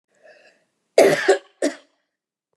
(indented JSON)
{
  "cough_length": "2.6 s",
  "cough_amplitude": 29015,
  "cough_signal_mean_std_ratio": 0.32,
  "survey_phase": "beta (2021-08-13 to 2022-03-07)",
  "age": "65+",
  "gender": "Female",
  "wearing_mask": "No",
  "symptom_none": true,
  "smoker_status": "Never smoked",
  "respiratory_condition_asthma": false,
  "respiratory_condition_other": false,
  "recruitment_source": "REACT",
  "submission_delay": "2 days",
  "covid_test_result": "Negative",
  "covid_test_method": "RT-qPCR",
  "influenza_a_test_result": "Negative",
  "influenza_b_test_result": "Negative"
}